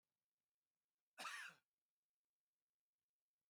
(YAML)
cough_length: 3.5 s
cough_amplitude: 412
cough_signal_mean_std_ratio: 0.25
survey_phase: beta (2021-08-13 to 2022-03-07)
age: 45-64
gender: Male
wearing_mask: 'No'
symptom_cough_any: true
symptom_fatigue: true
symptom_onset: 10 days
smoker_status: Never smoked
respiratory_condition_asthma: false
respiratory_condition_other: false
recruitment_source: REACT
submission_delay: 1 day
covid_test_result: Negative
covid_test_method: RT-qPCR
influenza_a_test_result: Unknown/Void
influenza_b_test_result: Unknown/Void